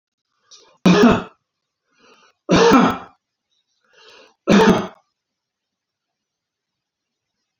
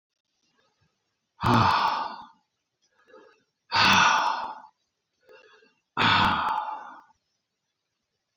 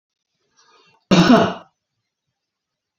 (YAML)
three_cough_length: 7.6 s
three_cough_amplitude: 29775
three_cough_signal_mean_std_ratio: 0.33
exhalation_length: 8.4 s
exhalation_amplitude: 13647
exhalation_signal_mean_std_ratio: 0.43
cough_length: 3.0 s
cough_amplitude: 32367
cough_signal_mean_std_ratio: 0.3
survey_phase: beta (2021-08-13 to 2022-03-07)
age: 65+
gender: Male
wearing_mask: 'No'
symptom_none: true
smoker_status: Never smoked
respiratory_condition_asthma: false
respiratory_condition_other: false
recruitment_source: REACT
submission_delay: 3 days
covid_test_result: Negative
covid_test_method: RT-qPCR
influenza_a_test_result: Negative
influenza_b_test_result: Negative